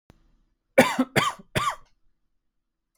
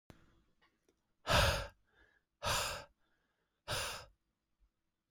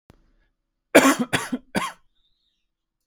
three_cough_length: 3.0 s
three_cough_amplitude: 25642
three_cough_signal_mean_std_ratio: 0.31
exhalation_length: 5.1 s
exhalation_amplitude: 5077
exhalation_signal_mean_std_ratio: 0.34
cough_length: 3.1 s
cough_amplitude: 30120
cough_signal_mean_std_ratio: 0.29
survey_phase: alpha (2021-03-01 to 2021-08-12)
age: 18-44
gender: Male
wearing_mask: 'No'
symptom_new_continuous_cough: true
symptom_onset: 12 days
smoker_status: Never smoked
respiratory_condition_asthma: false
respiratory_condition_other: false
recruitment_source: Test and Trace
submission_delay: 1 day
covid_test_result: Positive
covid_test_method: RT-qPCR
covid_ct_value: 29.9
covid_ct_gene: ORF1ab gene
covid_ct_mean: 30.9
covid_viral_load: 74 copies/ml
covid_viral_load_category: Minimal viral load (< 10K copies/ml)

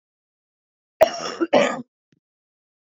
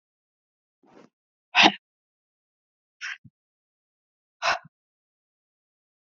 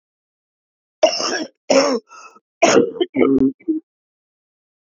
cough_length: 3.0 s
cough_amplitude: 24936
cough_signal_mean_std_ratio: 0.29
exhalation_length: 6.1 s
exhalation_amplitude: 26331
exhalation_signal_mean_std_ratio: 0.17
three_cough_length: 4.9 s
three_cough_amplitude: 32767
three_cough_signal_mean_std_ratio: 0.44
survey_phase: beta (2021-08-13 to 2022-03-07)
age: 45-64
gender: Female
wearing_mask: 'No'
symptom_cough_any: true
symptom_runny_or_blocked_nose: true
symptom_shortness_of_breath: true
symptom_fatigue: true
symptom_headache: true
symptom_onset: 7 days
smoker_status: Ex-smoker
respiratory_condition_asthma: false
respiratory_condition_other: false
recruitment_source: Test and Trace
submission_delay: 2 days
covid_test_result: Positive
covid_test_method: RT-qPCR
covid_ct_value: 19.3
covid_ct_gene: N gene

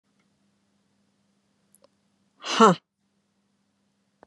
exhalation_length: 4.3 s
exhalation_amplitude: 26428
exhalation_signal_mean_std_ratio: 0.17
survey_phase: beta (2021-08-13 to 2022-03-07)
age: 45-64
gender: Female
wearing_mask: 'No'
symptom_none: true
smoker_status: Never smoked
respiratory_condition_asthma: true
respiratory_condition_other: false
recruitment_source: REACT
submission_delay: 3 days
covid_test_result: Negative
covid_test_method: RT-qPCR
influenza_a_test_result: Negative
influenza_b_test_result: Negative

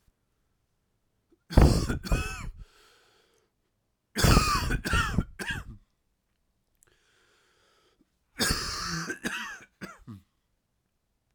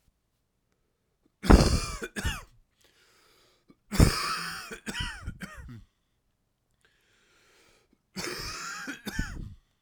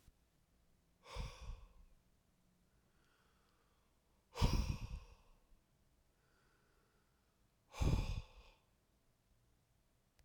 three_cough_length: 11.3 s
three_cough_amplitude: 21162
three_cough_signal_mean_std_ratio: 0.35
cough_length: 9.8 s
cough_amplitude: 24110
cough_signal_mean_std_ratio: 0.3
exhalation_length: 10.2 s
exhalation_amplitude: 3260
exhalation_signal_mean_std_ratio: 0.29
survey_phase: alpha (2021-03-01 to 2021-08-12)
age: 18-44
gender: Male
wearing_mask: 'No'
symptom_cough_any: true
symptom_fatigue: true
symptom_fever_high_temperature: true
symptom_change_to_sense_of_smell_or_taste: true
smoker_status: Never smoked
respiratory_condition_asthma: false
respiratory_condition_other: false
recruitment_source: Test and Trace
submission_delay: 0 days
covid_test_result: Positive
covid_test_method: LFT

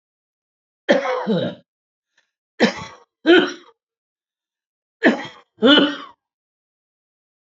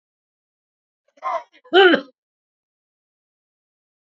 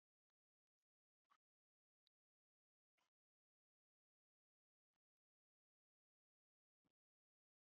three_cough_length: 7.5 s
three_cough_amplitude: 27709
three_cough_signal_mean_std_ratio: 0.34
cough_length: 4.1 s
cough_amplitude: 27208
cough_signal_mean_std_ratio: 0.23
exhalation_length: 7.7 s
exhalation_amplitude: 20
exhalation_signal_mean_std_ratio: 0.09
survey_phase: beta (2021-08-13 to 2022-03-07)
age: 65+
gender: Male
wearing_mask: 'No'
symptom_none: true
smoker_status: Ex-smoker
respiratory_condition_asthma: false
respiratory_condition_other: false
recruitment_source: REACT
submission_delay: 0 days
covid_test_result: Negative
covid_test_method: RT-qPCR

